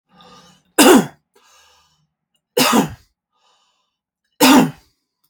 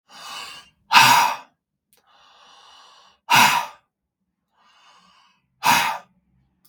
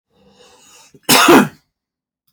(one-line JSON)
{"three_cough_length": "5.3 s", "three_cough_amplitude": 32768, "three_cough_signal_mean_std_ratio": 0.33, "exhalation_length": "6.7 s", "exhalation_amplitude": 32768, "exhalation_signal_mean_std_ratio": 0.33, "cough_length": "2.3 s", "cough_amplitude": 32768, "cough_signal_mean_std_ratio": 0.35, "survey_phase": "beta (2021-08-13 to 2022-03-07)", "age": "45-64", "gender": "Male", "wearing_mask": "No", "symptom_none": true, "smoker_status": "Ex-smoker", "respiratory_condition_asthma": false, "respiratory_condition_other": false, "recruitment_source": "REACT", "submission_delay": "2 days", "covid_test_result": "Negative", "covid_test_method": "RT-qPCR", "influenza_a_test_result": "Negative", "influenza_b_test_result": "Negative"}